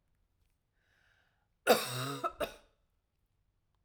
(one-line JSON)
{"cough_length": "3.8 s", "cough_amplitude": 8566, "cough_signal_mean_std_ratio": 0.27, "survey_phase": "alpha (2021-03-01 to 2021-08-12)", "age": "18-44", "gender": "Female", "wearing_mask": "No", "symptom_none": true, "smoker_status": "Ex-smoker", "respiratory_condition_asthma": false, "respiratory_condition_other": false, "recruitment_source": "REACT", "submission_delay": "1 day", "covid_test_result": "Negative", "covid_test_method": "RT-qPCR"}